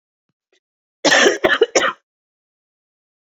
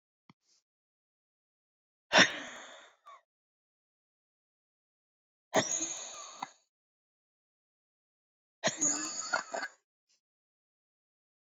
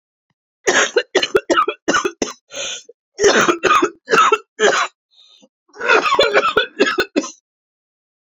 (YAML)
cough_length: 3.2 s
cough_amplitude: 28681
cough_signal_mean_std_ratio: 0.36
exhalation_length: 11.4 s
exhalation_amplitude: 13251
exhalation_signal_mean_std_ratio: 0.25
three_cough_length: 8.4 s
three_cough_amplitude: 30014
three_cough_signal_mean_std_ratio: 0.53
survey_phase: beta (2021-08-13 to 2022-03-07)
age: 45-64
gender: Female
wearing_mask: 'No'
symptom_cough_any: true
symptom_runny_or_blocked_nose: true
symptom_shortness_of_breath: true
symptom_fatigue: true
symptom_fever_high_temperature: true
symptom_headache: true
symptom_other: true
symptom_onset: 4 days
smoker_status: Never smoked
respiratory_condition_asthma: true
respiratory_condition_other: false
recruitment_source: Test and Trace
submission_delay: 2 days
covid_test_result: Positive
covid_test_method: ePCR